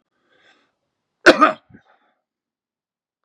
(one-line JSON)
{"cough_length": "3.2 s", "cough_amplitude": 32768, "cough_signal_mean_std_ratio": 0.19, "survey_phase": "beta (2021-08-13 to 2022-03-07)", "age": "45-64", "gender": "Male", "wearing_mask": "No", "symptom_none": true, "smoker_status": "Never smoked", "respiratory_condition_asthma": false, "respiratory_condition_other": false, "recruitment_source": "REACT", "submission_delay": "1 day", "covid_test_result": "Negative", "covid_test_method": "RT-qPCR", "influenza_a_test_result": "Negative", "influenza_b_test_result": "Negative"}